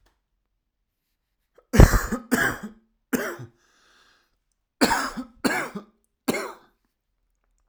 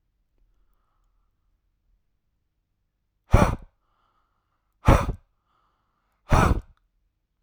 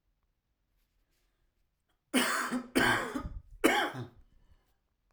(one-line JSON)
{"cough_length": "7.7 s", "cough_amplitude": 32768, "cough_signal_mean_std_ratio": 0.28, "exhalation_length": "7.4 s", "exhalation_amplitude": 32287, "exhalation_signal_mean_std_ratio": 0.23, "three_cough_length": "5.1 s", "three_cough_amplitude": 10937, "three_cough_signal_mean_std_ratio": 0.41, "survey_phase": "alpha (2021-03-01 to 2021-08-12)", "age": "18-44", "gender": "Male", "wearing_mask": "No", "symptom_none": true, "smoker_status": "Never smoked", "respiratory_condition_asthma": false, "respiratory_condition_other": false, "recruitment_source": "REACT", "submission_delay": "1 day", "covid_test_result": "Negative", "covid_test_method": "RT-qPCR"}